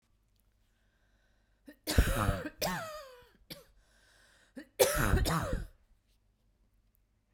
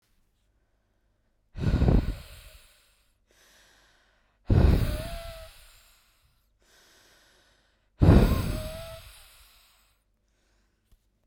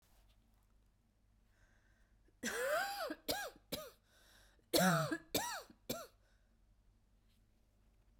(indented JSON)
{
  "cough_length": "7.3 s",
  "cough_amplitude": 10525,
  "cough_signal_mean_std_ratio": 0.38,
  "exhalation_length": "11.3 s",
  "exhalation_amplitude": 16850,
  "exhalation_signal_mean_std_ratio": 0.31,
  "three_cough_length": "8.2 s",
  "three_cough_amplitude": 3762,
  "three_cough_signal_mean_std_ratio": 0.38,
  "survey_phase": "beta (2021-08-13 to 2022-03-07)",
  "age": "18-44",
  "gender": "Female",
  "wearing_mask": "No",
  "symptom_cough_any": true,
  "symptom_runny_or_blocked_nose": true,
  "symptom_shortness_of_breath": true,
  "symptom_sore_throat": true,
  "symptom_fatigue": true,
  "symptom_headache": true,
  "symptom_onset": "2 days",
  "smoker_status": "Ex-smoker",
  "respiratory_condition_asthma": false,
  "respiratory_condition_other": false,
  "recruitment_source": "Test and Trace",
  "submission_delay": "1 day",
  "covid_test_result": "Negative",
  "covid_test_method": "RT-qPCR"
}